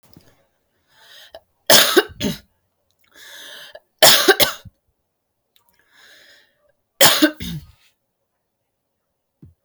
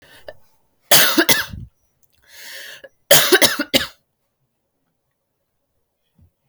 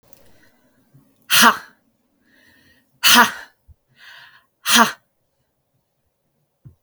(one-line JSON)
{"three_cough_length": "9.6 s", "three_cough_amplitude": 32768, "three_cough_signal_mean_std_ratio": 0.28, "cough_length": "6.5 s", "cough_amplitude": 32768, "cough_signal_mean_std_ratio": 0.32, "exhalation_length": "6.8 s", "exhalation_amplitude": 32768, "exhalation_signal_mean_std_ratio": 0.27, "survey_phase": "beta (2021-08-13 to 2022-03-07)", "age": "18-44", "gender": "Female", "wearing_mask": "No", "symptom_cough_any": true, "symptom_runny_or_blocked_nose": true, "symptom_headache": true, "symptom_onset": "8 days", "smoker_status": "Never smoked", "respiratory_condition_asthma": false, "respiratory_condition_other": false, "recruitment_source": "REACT", "submission_delay": "2 days", "covid_test_result": "Negative", "covid_test_method": "RT-qPCR", "influenza_a_test_result": "Negative", "influenza_b_test_result": "Negative"}